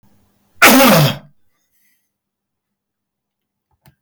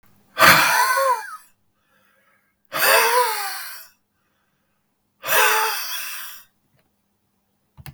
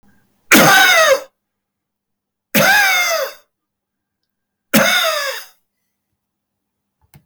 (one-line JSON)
{"cough_length": "4.0 s", "cough_amplitude": 32768, "cough_signal_mean_std_ratio": 0.33, "exhalation_length": "7.9 s", "exhalation_amplitude": 32768, "exhalation_signal_mean_std_ratio": 0.45, "three_cough_length": "7.3 s", "three_cough_amplitude": 32768, "three_cough_signal_mean_std_ratio": 0.45, "survey_phase": "beta (2021-08-13 to 2022-03-07)", "age": "65+", "gender": "Male", "wearing_mask": "No", "symptom_none": true, "smoker_status": "Never smoked", "respiratory_condition_asthma": true, "respiratory_condition_other": false, "recruitment_source": "REACT", "submission_delay": "2 days", "covid_test_result": "Negative", "covid_test_method": "RT-qPCR", "influenza_a_test_result": "Negative", "influenza_b_test_result": "Negative"}